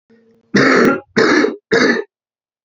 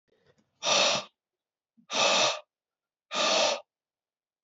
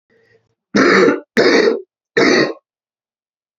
{"cough_length": "2.6 s", "cough_amplitude": 28979, "cough_signal_mean_std_ratio": 0.59, "exhalation_length": "4.4 s", "exhalation_amplitude": 9343, "exhalation_signal_mean_std_ratio": 0.46, "three_cough_length": "3.6 s", "three_cough_amplitude": 32768, "three_cough_signal_mean_std_ratio": 0.51, "survey_phase": "alpha (2021-03-01 to 2021-08-12)", "age": "45-64", "gender": "Male", "wearing_mask": "No", "symptom_cough_any": true, "symptom_new_continuous_cough": true, "symptom_fatigue": true, "symptom_fever_high_temperature": true, "symptom_onset": "3 days", "smoker_status": "Never smoked", "respiratory_condition_asthma": false, "respiratory_condition_other": false, "recruitment_source": "Test and Trace", "submission_delay": "1 day", "covid_test_result": "Positive", "covid_test_method": "RT-qPCR", "covid_ct_value": 28.4, "covid_ct_gene": "ORF1ab gene"}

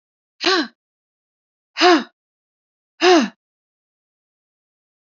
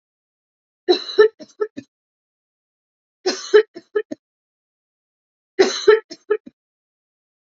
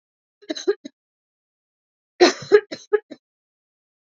{"exhalation_length": "5.1 s", "exhalation_amplitude": 27689, "exhalation_signal_mean_std_ratio": 0.29, "three_cough_length": "7.6 s", "three_cough_amplitude": 27538, "three_cough_signal_mean_std_ratio": 0.26, "cough_length": "4.0 s", "cough_amplitude": 27820, "cough_signal_mean_std_ratio": 0.24, "survey_phase": "beta (2021-08-13 to 2022-03-07)", "age": "18-44", "gender": "Female", "wearing_mask": "No", "symptom_cough_any": true, "symptom_runny_or_blocked_nose": true, "symptom_sore_throat": true, "symptom_fatigue": true, "symptom_headache": true, "symptom_onset": "8 days", "smoker_status": "Ex-smoker", "respiratory_condition_asthma": false, "respiratory_condition_other": false, "recruitment_source": "Test and Trace", "submission_delay": "1 day", "covid_test_result": "Positive", "covid_test_method": "RT-qPCR", "covid_ct_value": 26.5, "covid_ct_gene": "ORF1ab gene"}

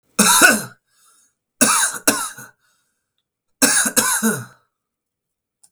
{"three_cough_length": "5.7 s", "three_cough_amplitude": 32768, "three_cough_signal_mean_std_ratio": 0.42, "survey_phase": "beta (2021-08-13 to 2022-03-07)", "age": "18-44", "gender": "Male", "wearing_mask": "No", "symptom_none": true, "smoker_status": "Never smoked", "respiratory_condition_asthma": true, "respiratory_condition_other": false, "recruitment_source": "REACT", "submission_delay": "12 days", "covid_test_result": "Negative", "covid_test_method": "RT-qPCR", "influenza_a_test_result": "Negative", "influenza_b_test_result": "Negative"}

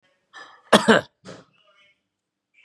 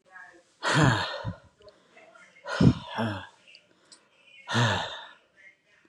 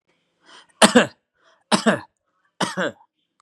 {"cough_length": "2.6 s", "cough_amplitude": 32767, "cough_signal_mean_std_ratio": 0.23, "exhalation_length": "5.9 s", "exhalation_amplitude": 16558, "exhalation_signal_mean_std_ratio": 0.4, "three_cough_length": "3.4 s", "three_cough_amplitude": 32767, "three_cough_signal_mean_std_ratio": 0.3, "survey_phase": "beta (2021-08-13 to 2022-03-07)", "age": "45-64", "gender": "Male", "wearing_mask": "No", "symptom_none": true, "smoker_status": "Ex-smoker", "respiratory_condition_asthma": false, "respiratory_condition_other": false, "recruitment_source": "REACT", "submission_delay": "2 days", "covid_test_result": "Negative", "covid_test_method": "RT-qPCR", "influenza_a_test_result": "Negative", "influenza_b_test_result": "Negative"}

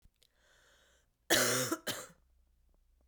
{"cough_length": "3.1 s", "cough_amplitude": 6865, "cough_signal_mean_std_ratio": 0.35, "survey_phase": "beta (2021-08-13 to 2022-03-07)", "age": "18-44", "gender": "Female", "wearing_mask": "No", "symptom_cough_any": true, "symptom_new_continuous_cough": true, "symptom_runny_or_blocked_nose": true, "symptom_fatigue": true, "symptom_headache": true, "symptom_onset": "6 days", "smoker_status": "Never smoked", "respiratory_condition_asthma": true, "respiratory_condition_other": false, "recruitment_source": "REACT", "submission_delay": "1 day", "covid_test_result": "Negative", "covid_test_method": "RT-qPCR", "influenza_a_test_result": "Negative", "influenza_b_test_result": "Negative"}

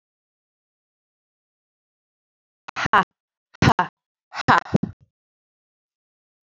{"exhalation_length": "6.5 s", "exhalation_amplitude": 27943, "exhalation_signal_mean_std_ratio": 0.21, "survey_phase": "beta (2021-08-13 to 2022-03-07)", "age": "18-44", "gender": "Female", "wearing_mask": "No", "symptom_none": true, "smoker_status": "Ex-smoker", "respiratory_condition_asthma": false, "respiratory_condition_other": false, "recruitment_source": "REACT", "submission_delay": "3 days", "covid_test_result": "Negative", "covid_test_method": "RT-qPCR", "influenza_a_test_result": "Negative", "influenza_b_test_result": "Negative"}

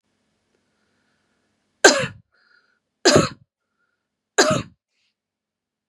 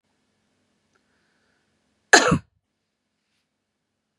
{"three_cough_length": "5.9 s", "three_cough_amplitude": 32768, "three_cough_signal_mean_std_ratio": 0.24, "cough_length": "4.2 s", "cough_amplitude": 32768, "cough_signal_mean_std_ratio": 0.17, "survey_phase": "beta (2021-08-13 to 2022-03-07)", "age": "45-64", "gender": "Female", "wearing_mask": "No", "symptom_runny_or_blocked_nose": true, "smoker_status": "Never smoked", "respiratory_condition_asthma": false, "respiratory_condition_other": false, "recruitment_source": "REACT", "submission_delay": "2 days", "covid_test_result": "Negative", "covid_test_method": "RT-qPCR", "influenza_a_test_result": "Unknown/Void", "influenza_b_test_result": "Unknown/Void"}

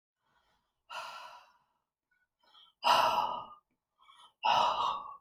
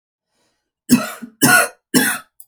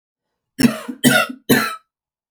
{"exhalation_length": "5.2 s", "exhalation_amplitude": 6302, "exhalation_signal_mean_std_ratio": 0.41, "three_cough_length": "2.5 s", "three_cough_amplitude": 32768, "three_cough_signal_mean_std_ratio": 0.42, "cough_length": "2.3 s", "cough_amplitude": 31866, "cough_signal_mean_std_ratio": 0.42, "survey_phase": "alpha (2021-03-01 to 2021-08-12)", "age": "18-44", "gender": "Female", "wearing_mask": "No", "symptom_none": true, "smoker_status": "Current smoker (11 or more cigarettes per day)", "respiratory_condition_asthma": false, "respiratory_condition_other": false, "recruitment_source": "REACT", "submission_delay": "1 day", "covid_test_result": "Negative", "covid_test_method": "RT-qPCR"}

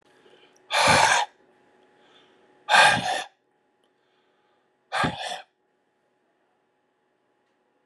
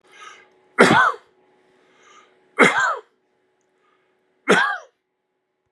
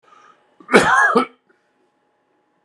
{"exhalation_length": "7.9 s", "exhalation_amplitude": 24682, "exhalation_signal_mean_std_ratio": 0.32, "three_cough_length": "5.7 s", "three_cough_amplitude": 32768, "three_cough_signal_mean_std_ratio": 0.33, "cough_length": "2.6 s", "cough_amplitude": 32768, "cough_signal_mean_std_ratio": 0.36, "survey_phase": "beta (2021-08-13 to 2022-03-07)", "age": "65+", "gender": "Male", "wearing_mask": "No", "symptom_none": true, "smoker_status": "Never smoked", "respiratory_condition_asthma": false, "respiratory_condition_other": false, "recruitment_source": "REACT", "submission_delay": "1 day", "covid_test_result": "Negative", "covid_test_method": "RT-qPCR"}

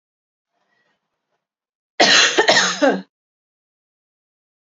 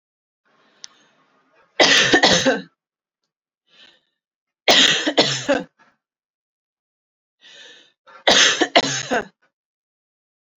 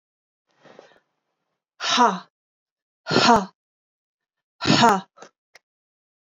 {"cough_length": "4.7 s", "cough_amplitude": 32766, "cough_signal_mean_std_ratio": 0.34, "three_cough_length": "10.6 s", "three_cough_amplitude": 32767, "three_cough_signal_mean_std_ratio": 0.36, "exhalation_length": "6.2 s", "exhalation_amplitude": 25811, "exhalation_signal_mean_std_ratio": 0.31, "survey_phase": "beta (2021-08-13 to 2022-03-07)", "age": "18-44", "gender": "Female", "wearing_mask": "No", "symptom_none": true, "smoker_status": "Ex-smoker", "respiratory_condition_asthma": false, "respiratory_condition_other": false, "recruitment_source": "REACT", "submission_delay": "2 days", "covid_test_result": "Negative", "covid_test_method": "RT-qPCR"}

